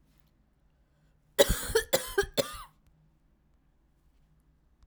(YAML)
three_cough_length: 4.9 s
three_cough_amplitude: 17913
three_cough_signal_mean_std_ratio: 0.27
survey_phase: beta (2021-08-13 to 2022-03-07)
age: 18-44
gender: Female
wearing_mask: 'No'
symptom_cough_any: true
symptom_runny_or_blocked_nose: true
symptom_fatigue: true
symptom_onset: 9 days
smoker_status: Never smoked
respiratory_condition_asthma: true
respiratory_condition_other: false
recruitment_source: REACT
submission_delay: 4 days
covid_test_result: Negative
covid_test_method: RT-qPCR
influenza_a_test_result: Unknown/Void
influenza_b_test_result: Unknown/Void